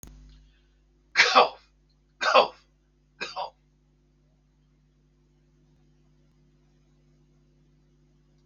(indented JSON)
{
  "three_cough_length": "8.5 s",
  "three_cough_amplitude": 25265,
  "three_cough_signal_mean_std_ratio": 0.22,
  "survey_phase": "beta (2021-08-13 to 2022-03-07)",
  "age": "65+",
  "gender": "Male",
  "wearing_mask": "No",
  "symptom_runny_or_blocked_nose": true,
  "smoker_status": "Ex-smoker",
  "respiratory_condition_asthma": false,
  "respiratory_condition_other": false,
  "recruitment_source": "REACT",
  "submission_delay": "7 days",
  "covid_test_result": "Negative",
  "covid_test_method": "RT-qPCR"
}